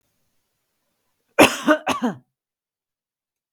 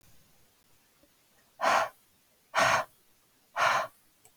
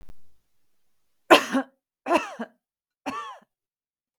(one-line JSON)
{"cough_length": "3.5 s", "cough_amplitude": 32768, "cough_signal_mean_std_ratio": 0.26, "exhalation_length": "4.4 s", "exhalation_amplitude": 8625, "exhalation_signal_mean_std_ratio": 0.37, "three_cough_length": "4.2 s", "three_cough_amplitude": 32768, "three_cough_signal_mean_std_ratio": 0.27, "survey_phase": "beta (2021-08-13 to 2022-03-07)", "age": "45-64", "gender": "Female", "wearing_mask": "No", "symptom_fatigue": true, "smoker_status": "Never smoked", "respiratory_condition_asthma": false, "respiratory_condition_other": false, "recruitment_source": "REACT", "submission_delay": "2 days", "covid_test_result": "Negative", "covid_test_method": "RT-qPCR", "influenza_a_test_result": "Negative", "influenza_b_test_result": "Negative"}